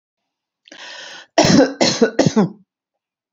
{
  "three_cough_length": "3.3 s",
  "three_cough_amplitude": 32079,
  "three_cough_signal_mean_std_ratio": 0.42,
  "survey_phase": "beta (2021-08-13 to 2022-03-07)",
  "age": "45-64",
  "gender": "Female",
  "wearing_mask": "No",
  "symptom_none": true,
  "smoker_status": "Never smoked",
  "respiratory_condition_asthma": false,
  "respiratory_condition_other": false,
  "recruitment_source": "REACT",
  "submission_delay": "2 days",
  "covid_test_result": "Negative",
  "covid_test_method": "RT-qPCR",
  "influenza_a_test_result": "Negative",
  "influenza_b_test_result": "Negative"
}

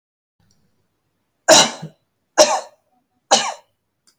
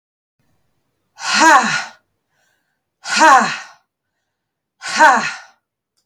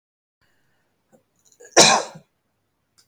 {
  "three_cough_length": "4.2 s",
  "three_cough_amplitude": 32768,
  "three_cough_signal_mean_std_ratio": 0.28,
  "exhalation_length": "6.1 s",
  "exhalation_amplitude": 32768,
  "exhalation_signal_mean_std_ratio": 0.37,
  "cough_length": "3.1 s",
  "cough_amplitude": 32768,
  "cough_signal_mean_std_ratio": 0.23,
  "survey_phase": "beta (2021-08-13 to 2022-03-07)",
  "age": "45-64",
  "gender": "Female",
  "wearing_mask": "No",
  "symptom_none": true,
  "smoker_status": "Never smoked",
  "respiratory_condition_asthma": false,
  "respiratory_condition_other": false,
  "recruitment_source": "REACT",
  "submission_delay": "8 days",
  "covid_test_result": "Negative",
  "covid_test_method": "RT-qPCR",
  "influenza_a_test_result": "Negative",
  "influenza_b_test_result": "Negative"
}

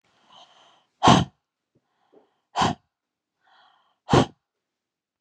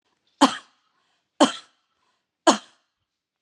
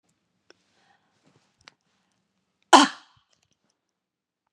{
  "exhalation_length": "5.2 s",
  "exhalation_amplitude": 26969,
  "exhalation_signal_mean_std_ratio": 0.24,
  "three_cough_length": "3.4 s",
  "three_cough_amplitude": 30511,
  "three_cough_signal_mean_std_ratio": 0.22,
  "cough_length": "4.5 s",
  "cough_amplitude": 32767,
  "cough_signal_mean_std_ratio": 0.14,
  "survey_phase": "beta (2021-08-13 to 2022-03-07)",
  "age": "45-64",
  "gender": "Female",
  "wearing_mask": "No",
  "symptom_runny_or_blocked_nose": true,
  "symptom_sore_throat": true,
  "symptom_onset": "2 days",
  "smoker_status": "Ex-smoker",
  "respiratory_condition_asthma": false,
  "respiratory_condition_other": false,
  "recruitment_source": "REACT",
  "submission_delay": "1 day",
  "covid_test_result": "Negative",
  "covid_test_method": "RT-qPCR"
}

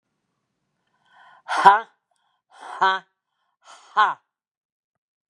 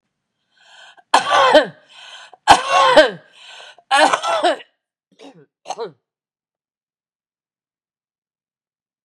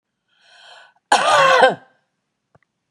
{
  "exhalation_length": "5.3 s",
  "exhalation_amplitude": 32768,
  "exhalation_signal_mean_std_ratio": 0.25,
  "three_cough_length": "9.0 s",
  "three_cough_amplitude": 32768,
  "three_cough_signal_mean_std_ratio": 0.34,
  "cough_length": "2.9 s",
  "cough_amplitude": 32768,
  "cough_signal_mean_std_ratio": 0.38,
  "survey_phase": "beta (2021-08-13 to 2022-03-07)",
  "age": "45-64",
  "gender": "Female",
  "wearing_mask": "No",
  "symptom_cough_any": true,
  "symptom_shortness_of_breath": true,
  "symptom_fatigue": true,
  "symptom_onset": "12 days",
  "smoker_status": "Never smoked",
  "respiratory_condition_asthma": false,
  "respiratory_condition_other": false,
  "recruitment_source": "REACT",
  "submission_delay": "2 days",
  "covid_test_result": "Negative",
  "covid_test_method": "RT-qPCR",
  "influenza_a_test_result": "Negative",
  "influenza_b_test_result": "Negative"
}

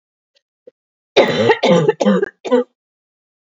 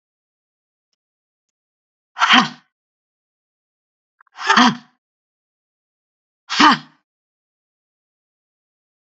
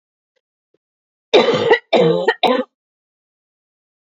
{
  "cough_length": "3.6 s",
  "cough_amplitude": 27592,
  "cough_signal_mean_std_ratio": 0.45,
  "exhalation_length": "9.0 s",
  "exhalation_amplitude": 32507,
  "exhalation_signal_mean_std_ratio": 0.23,
  "three_cough_length": "4.1 s",
  "three_cough_amplitude": 28546,
  "three_cough_signal_mean_std_ratio": 0.4,
  "survey_phase": "beta (2021-08-13 to 2022-03-07)",
  "age": "45-64",
  "gender": "Female",
  "wearing_mask": "No",
  "symptom_none": true,
  "symptom_onset": "6 days",
  "smoker_status": "Never smoked",
  "respiratory_condition_asthma": false,
  "respiratory_condition_other": false,
  "recruitment_source": "REACT",
  "submission_delay": "3 days",
  "covid_test_result": "Negative",
  "covid_test_method": "RT-qPCR",
  "influenza_a_test_result": "Negative",
  "influenza_b_test_result": "Negative"
}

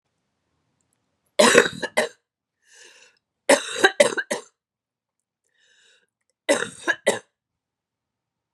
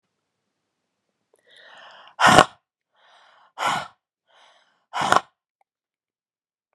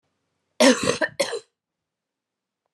{
  "three_cough_length": "8.5 s",
  "three_cough_amplitude": 32768,
  "three_cough_signal_mean_std_ratio": 0.28,
  "exhalation_length": "6.7 s",
  "exhalation_amplitude": 32768,
  "exhalation_signal_mean_std_ratio": 0.22,
  "cough_length": "2.7 s",
  "cough_amplitude": 25527,
  "cough_signal_mean_std_ratio": 0.31,
  "survey_phase": "beta (2021-08-13 to 2022-03-07)",
  "age": "45-64",
  "gender": "Female",
  "wearing_mask": "No",
  "symptom_cough_any": true,
  "symptom_runny_or_blocked_nose": true,
  "symptom_sore_throat": true,
  "symptom_fever_high_temperature": true,
  "symptom_headache": true,
  "symptom_change_to_sense_of_smell_or_taste": true,
  "smoker_status": "Ex-smoker",
  "respiratory_condition_asthma": false,
  "respiratory_condition_other": false,
  "recruitment_source": "Test and Trace",
  "submission_delay": "2 days",
  "covid_test_result": "Positive",
  "covid_test_method": "RT-qPCR",
  "covid_ct_value": 26.0,
  "covid_ct_gene": "ORF1ab gene"
}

